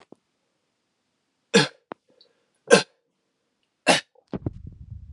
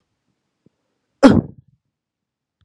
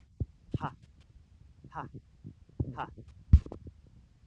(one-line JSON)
{"three_cough_length": "5.1 s", "three_cough_amplitude": 30749, "three_cough_signal_mean_std_ratio": 0.22, "cough_length": "2.6 s", "cough_amplitude": 32768, "cough_signal_mean_std_ratio": 0.2, "exhalation_length": "4.3 s", "exhalation_amplitude": 12837, "exhalation_signal_mean_std_ratio": 0.23, "survey_phase": "alpha (2021-03-01 to 2021-08-12)", "age": "18-44", "gender": "Male", "wearing_mask": "No", "symptom_headache": true, "smoker_status": "Never smoked", "respiratory_condition_asthma": false, "respiratory_condition_other": false, "recruitment_source": "Test and Trace", "submission_delay": "2 days", "covid_test_result": "Positive", "covid_test_method": "RT-qPCR", "covid_ct_value": 15.4, "covid_ct_gene": "ORF1ab gene", "covid_ct_mean": 16.0, "covid_viral_load": "5600000 copies/ml", "covid_viral_load_category": "High viral load (>1M copies/ml)"}